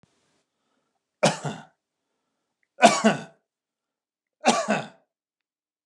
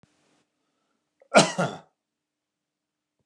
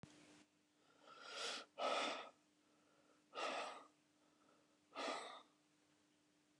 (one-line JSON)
{"three_cough_length": "5.9 s", "three_cough_amplitude": 28664, "three_cough_signal_mean_std_ratio": 0.27, "cough_length": "3.3 s", "cough_amplitude": 26176, "cough_signal_mean_std_ratio": 0.2, "exhalation_length": "6.6 s", "exhalation_amplitude": 1037, "exhalation_signal_mean_std_ratio": 0.45, "survey_phase": "beta (2021-08-13 to 2022-03-07)", "age": "65+", "gender": "Male", "wearing_mask": "No", "symptom_none": true, "smoker_status": "Ex-smoker", "respiratory_condition_asthma": false, "respiratory_condition_other": false, "recruitment_source": "REACT", "submission_delay": "1 day", "covid_test_result": "Negative", "covid_test_method": "RT-qPCR", "influenza_a_test_result": "Negative", "influenza_b_test_result": "Negative"}